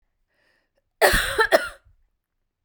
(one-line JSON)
{"cough_length": "2.6 s", "cough_amplitude": 29705, "cough_signal_mean_std_ratio": 0.35, "survey_phase": "beta (2021-08-13 to 2022-03-07)", "age": "45-64", "gender": "Female", "wearing_mask": "No", "symptom_cough_any": true, "symptom_runny_or_blocked_nose": true, "symptom_fatigue": true, "symptom_fever_high_temperature": true, "symptom_headache": true, "symptom_onset": "2 days", "smoker_status": "Ex-smoker", "respiratory_condition_asthma": false, "respiratory_condition_other": false, "recruitment_source": "Test and Trace", "submission_delay": "2 days", "covid_test_result": "Positive", "covid_test_method": "RT-qPCR"}